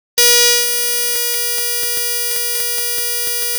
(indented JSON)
{
  "cough_length": "3.6 s",
  "cough_amplitude": 32767,
  "cough_signal_mean_std_ratio": 1.14,
  "survey_phase": "alpha (2021-03-01 to 2021-08-12)",
  "age": "65+",
  "gender": "Female",
  "wearing_mask": "No",
  "symptom_cough_any": true,
  "symptom_fatigue": true,
  "symptom_headache": true,
  "symptom_onset": "9 days",
  "smoker_status": "Ex-smoker",
  "respiratory_condition_asthma": false,
  "respiratory_condition_other": false,
  "recruitment_source": "REACT",
  "submission_delay": "7 days",
  "covid_test_result": "Negative",
  "covid_test_method": "RT-qPCR"
}